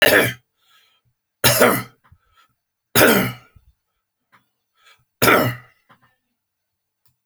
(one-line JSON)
{"cough_length": "7.3 s", "cough_amplitude": 32768, "cough_signal_mean_std_ratio": 0.34, "survey_phase": "alpha (2021-03-01 to 2021-08-12)", "age": "65+", "gender": "Male", "wearing_mask": "No", "symptom_none": true, "smoker_status": "Never smoked", "respiratory_condition_asthma": false, "respiratory_condition_other": false, "recruitment_source": "REACT", "submission_delay": "2 days", "covid_test_result": "Negative", "covid_test_method": "RT-qPCR"}